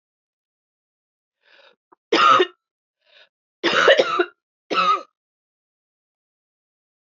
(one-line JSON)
{"three_cough_length": "7.1 s", "three_cough_amplitude": 27536, "three_cough_signal_mean_std_ratio": 0.32, "survey_phase": "beta (2021-08-13 to 2022-03-07)", "age": "45-64", "gender": "Female", "wearing_mask": "No", "symptom_cough_any": true, "symptom_runny_or_blocked_nose": true, "symptom_fatigue": true, "symptom_onset": "2 days", "smoker_status": "Never smoked", "respiratory_condition_asthma": false, "respiratory_condition_other": false, "recruitment_source": "Test and Trace", "submission_delay": "2 days", "covid_test_result": "Positive", "covid_test_method": "RT-qPCR", "covid_ct_value": 15.3, "covid_ct_gene": "ORF1ab gene", "covid_ct_mean": 15.6, "covid_viral_load": "7800000 copies/ml", "covid_viral_load_category": "High viral load (>1M copies/ml)"}